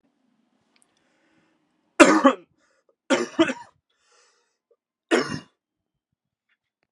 {"three_cough_length": "6.9 s", "three_cough_amplitude": 32768, "three_cough_signal_mean_std_ratio": 0.24, "survey_phase": "beta (2021-08-13 to 2022-03-07)", "age": "18-44", "gender": "Male", "wearing_mask": "No", "symptom_runny_or_blocked_nose": true, "symptom_onset": "4 days", "smoker_status": "Never smoked", "respiratory_condition_asthma": false, "respiratory_condition_other": false, "recruitment_source": "Test and Trace", "submission_delay": "2 days", "covid_test_result": "Positive", "covid_test_method": "RT-qPCR", "covid_ct_value": 16.6, "covid_ct_gene": "N gene", "covid_ct_mean": 17.5, "covid_viral_load": "1800000 copies/ml", "covid_viral_load_category": "High viral load (>1M copies/ml)"}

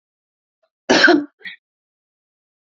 {"cough_length": "2.7 s", "cough_amplitude": 29325, "cough_signal_mean_std_ratio": 0.29, "survey_phase": "beta (2021-08-13 to 2022-03-07)", "age": "65+", "gender": "Female", "wearing_mask": "No", "symptom_none": true, "smoker_status": "Never smoked", "respiratory_condition_asthma": false, "respiratory_condition_other": false, "recruitment_source": "REACT", "submission_delay": "1 day", "covid_test_result": "Negative", "covid_test_method": "RT-qPCR", "influenza_a_test_result": "Negative", "influenza_b_test_result": "Negative"}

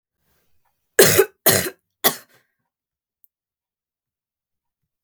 {"three_cough_length": "5.0 s", "three_cough_amplitude": 32768, "three_cough_signal_mean_std_ratio": 0.24, "survey_phase": "beta (2021-08-13 to 2022-03-07)", "age": "18-44", "gender": "Female", "wearing_mask": "No", "symptom_none": true, "smoker_status": "Never smoked", "respiratory_condition_asthma": false, "respiratory_condition_other": false, "recruitment_source": "REACT", "submission_delay": "2 days", "covid_test_result": "Negative", "covid_test_method": "RT-qPCR"}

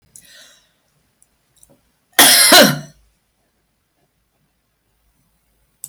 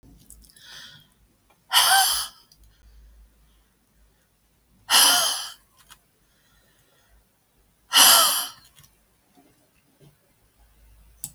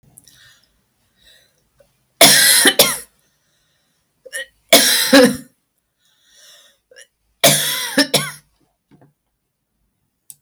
{"cough_length": "5.9 s", "cough_amplitude": 32768, "cough_signal_mean_std_ratio": 0.27, "exhalation_length": "11.3 s", "exhalation_amplitude": 26467, "exhalation_signal_mean_std_ratio": 0.3, "three_cough_length": "10.4 s", "three_cough_amplitude": 32768, "three_cough_signal_mean_std_ratio": 0.34, "survey_phase": "beta (2021-08-13 to 2022-03-07)", "age": "65+", "gender": "Female", "wearing_mask": "No", "symptom_none": true, "smoker_status": "Never smoked", "respiratory_condition_asthma": false, "respiratory_condition_other": false, "recruitment_source": "REACT", "submission_delay": "1 day", "covid_test_result": "Negative", "covid_test_method": "RT-qPCR", "influenza_a_test_result": "Negative", "influenza_b_test_result": "Negative"}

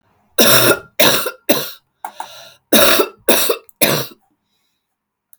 {"cough_length": "5.4 s", "cough_amplitude": 32768, "cough_signal_mean_std_ratio": 0.47, "survey_phase": "beta (2021-08-13 to 2022-03-07)", "age": "45-64", "gender": "Female", "wearing_mask": "No", "symptom_cough_any": true, "symptom_runny_or_blocked_nose": true, "symptom_diarrhoea": true, "symptom_fatigue": true, "symptom_onset": "8 days", "smoker_status": "Never smoked", "respiratory_condition_asthma": false, "respiratory_condition_other": false, "recruitment_source": "REACT", "submission_delay": "2 days", "covid_test_result": "Negative", "covid_test_method": "RT-qPCR"}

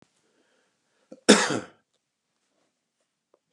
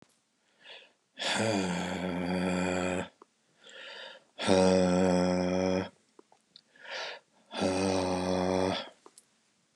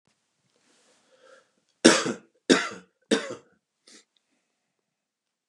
{"cough_length": "3.5 s", "cough_amplitude": 29758, "cough_signal_mean_std_ratio": 0.19, "exhalation_length": "9.8 s", "exhalation_amplitude": 9292, "exhalation_signal_mean_std_ratio": 0.61, "three_cough_length": "5.5 s", "three_cough_amplitude": 30004, "three_cough_signal_mean_std_ratio": 0.22, "survey_phase": "beta (2021-08-13 to 2022-03-07)", "age": "65+", "gender": "Male", "wearing_mask": "No", "symptom_none": true, "smoker_status": "Ex-smoker", "respiratory_condition_asthma": false, "respiratory_condition_other": false, "recruitment_source": "REACT", "submission_delay": "2 days", "covid_test_result": "Negative", "covid_test_method": "RT-qPCR", "influenza_a_test_result": "Negative", "influenza_b_test_result": "Negative"}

